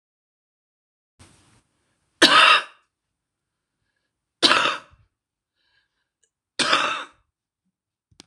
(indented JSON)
{
  "three_cough_length": "8.3 s",
  "three_cough_amplitude": 26028,
  "three_cough_signal_mean_std_ratio": 0.27,
  "survey_phase": "beta (2021-08-13 to 2022-03-07)",
  "age": "45-64",
  "gender": "Female",
  "wearing_mask": "No",
  "symptom_new_continuous_cough": true,
  "symptom_runny_or_blocked_nose": true,
  "symptom_sore_throat": true,
  "symptom_fatigue": true,
  "symptom_fever_high_temperature": true,
  "symptom_headache": true,
  "symptom_change_to_sense_of_smell_or_taste": true,
  "symptom_loss_of_taste": true,
  "symptom_onset": "3 days",
  "smoker_status": "Current smoker (11 or more cigarettes per day)",
  "respiratory_condition_asthma": false,
  "respiratory_condition_other": false,
  "recruitment_source": "Test and Trace",
  "submission_delay": "1 day",
  "covid_test_result": "Positive",
  "covid_test_method": "RT-qPCR",
  "covid_ct_value": 18.4,
  "covid_ct_gene": "ORF1ab gene",
  "covid_ct_mean": 18.8,
  "covid_viral_load": "710000 copies/ml",
  "covid_viral_load_category": "Low viral load (10K-1M copies/ml)"
}